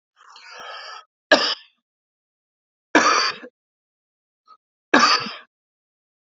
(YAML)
three_cough_length: 6.3 s
three_cough_amplitude: 30551
three_cough_signal_mean_std_ratio: 0.31
survey_phase: alpha (2021-03-01 to 2021-08-12)
age: 45-64
gender: Male
wearing_mask: 'No'
symptom_none: true
smoker_status: Ex-smoker
respiratory_condition_asthma: false
respiratory_condition_other: false
recruitment_source: REACT
submission_delay: 2 days
covid_test_result: Negative
covid_test_method: RT-qPCR